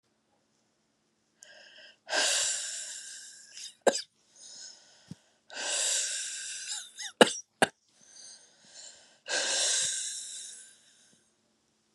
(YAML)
exhalation_length: 11.9 s
exhalation_amplitude: 22966
exhalation_signal_mean_std_ratio: 0.4
survey_phase: beta (2021-08-13 to 2022-03-07)
age: 45-64
gender: Female
wearing_mask: 'No'
symptom_cough_any: true
symptom_runny_or_blocked_nose: true
symptom_abdominal_pain: true
symptom_fatigue: true
symptom_fever_high_temperature: true
symptom_headache: true
symptom_change_to_sense_of_smell_or_taste: true
smoker_status: Never smoked
respiratory_condition_asthma: false
respiratory_condition_other: false
recruitment_source: Test and Trace
submission_delay: 1 day
covid_test_result: Positive
covid_test_method: LFT